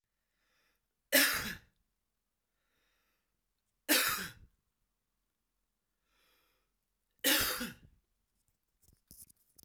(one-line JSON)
{"three_cough_length": "9.6 s", "three_cough_amplitude": 7923, "three_cough_signal_mean_std_ratio": 0.27, "survey_phase": "alpha (2021-03-01 to 2021-08-12)", "age": "18-44", "gender": "Male", "wearing_mask": "No", "symptom_none": true, "symptom_cough_any": true, "symptom_new_continuous_cough": true, "symptom_fever_high_temperature": true, "symptom_headache": true, "smoker_status": "Current smoker (e-cigarettes or vapes only)", "respiratory_condition_asthma": false, "respiratory_condition_other": false, "recruitment_source": "Test and Trace", "submission_delay": "2 days", "covid_test_result": "Positive", "covid_test_method": "RT-qPCR", "covid_ct_value": 16.7, "covid_ct_gene": "ORF1ab gene", "covid_ct_mean": 17.7, "covid_viral_load": "1500000 copies/ml", "covid_viral_load_category": "High viral load (>1M copies/ml)"}